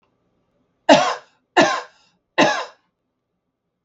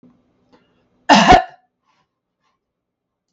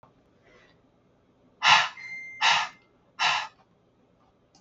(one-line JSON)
{"three_cough_length": "3.8 s", "three_cough_amplitude": 32768, "three_cough_signal_mean_std_ratio": 0.32, "cough_length": "3.3 s", "cough_amplitude": 32768, "cough_signal_mean_std_ratio": 0.26, "exhalation_length": "4.6 s", "exhalation_amplitude": 18132, "exhalation_signal_mean_std_ratio": 0.34, "survey_phase": "beta (2021-08-13 to 2022-03-07)", "age": "45-64", "gender": "Female", "wearing_mask": "No", "symptom_runny_or_blocked_nose": true, "symptom_sore_throat": true, "symptom_fatigue": true, "smoker_status": "Ex-smoker", "respiratory_condition_asthma": false, "respiratory_condition_other": false, "recruitment_source": "REACT", "submission_delay": "1 day", "covid_test_result": "Negative", "covid_test_method": "RT-qPCR"}